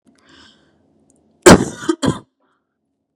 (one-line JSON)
{"cough_length": "3.2 s", "cough_amplitude": 32768, "cough_signal_mean_std_ratio": 0.24, "survey_phase": "beta (2021-08-13 to 2022-03-07)", "age": "18-44", "gender": "Female", "wearing_mask": "No", "symptom_none": true, "smoker_status": "Never smoked", "respiratory_condition_asthma": false, "respiratory_condition_other": false, "recruitment_source": "REACT", "submission_delay": "2 days", "covid_test_result": "Negative", "covid_test_method": "RT-qPCR", "influenza_a_test_result": "Negative", "influenza_b_test_result": "Negative"}